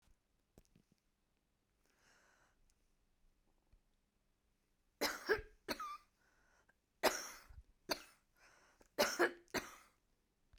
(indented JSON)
{
  "three_cough_length": "10.6 s",
  "three_cough_amplitude": 4693,
  "three_cough_signal_mean_std_ratio": 0.26,
  "survey_phase": "beta (2021-08-13 to 2022-03-07)",
  "age": "45-64",
  "gender": "Female",
  "wearing_mask": "No",
  "symptom_none": true,
  "smoker_status": "Current smoker (e-cigarettes or vapes only)",
  "respiratory_condition_asthma": false,
  "respiratory_condition_other": false,
  "recruitment_source": "REACT",
  "submission_delay": "2 days",
  "covid_test_result": "Negative",
  "covid_test_method": "RT-qPCR"
}